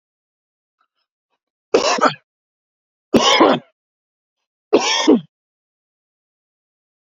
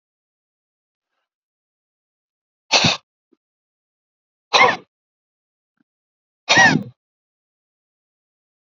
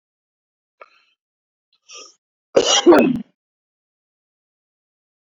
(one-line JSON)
{"three_cough_length": "7.1 s", "three_cough_amplitude": 30440, "three_cough_signal_mean_std_ratio": 0.32, "exhalation_length": "8.6 s", "exhalation_amplitude": 32707, "exhalation_signal_mean_std_ratio": 0.23, "cough_length": "5.3 s", "cough_amplitude": 30957, "cough_signal_mean_std_ratio": 0.25, "survey_phase": "beta (2021-08-13 to 2022-03-07)", "age": "45-64", "gender": "Male", "wearing_mask": "No", "symptom_none": true, "smoker_status": "Never smoked", "respiratory_condition_asthma": true, "respiratory_condition_other": false, "recruitment_source": "REACT", "submission_delay": "1 day", "covid_test_result": "Negative", "covid_test_method": "RT-qPCR", "influenza_a_test_result": "Negative", "influenza_b_test_result": "Negative"}